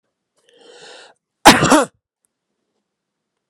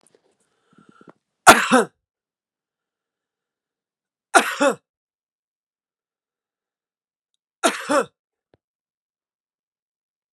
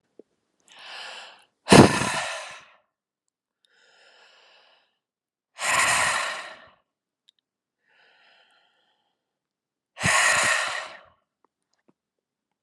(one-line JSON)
{"cough_length": "3.5 s", "cough_amplitude": 32768, "cough_signal_mean_std_ratio": 0.25, "three_cough_length": "10.3 s", "three_cough_amplitude": 32768, "three_cough_signal_mean_std_ratio": 0.2, "exhalation_length": "12.6 s", "exhalation_amplitude": 32643, "exhalation_signal_mean_std_ratio": 0.29, "survey_phase": "alpha (2021-03-01 to 2021-08-12)", "age": "45-64", "gender": "Male", "wearing_mask": "No", "symptom_none": true, "smoker_status": "Never smoked", "respiratory_condition_asthma": false, "respiratory_condition_other": false, "recruitment_source": "REACT", "submission_delay": "3 days", "covid_test_result": "Negative", "covid_test_method": "RT-qPCR"}